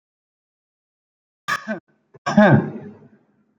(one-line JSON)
{"cough_length": "3.6 s", "cough_amplitude": 30267, "cough_signal_mean_std_ratio": 0.28, "survey_phase": "beta (2021-08-13 to 2022-03-07)", "age": "18-44", "gender": "Male", "wearing_mask": "Yes", "symptom_none": true, "smoker_status": "Never smoked", "respiratory_condition_asthma": false, "respiratory_condition_other": false, "recruitment_source": "REACT", "submission_delay": "3 days", "covid_test_result": "Negative", "covid_test_method": "RT-qPCR"}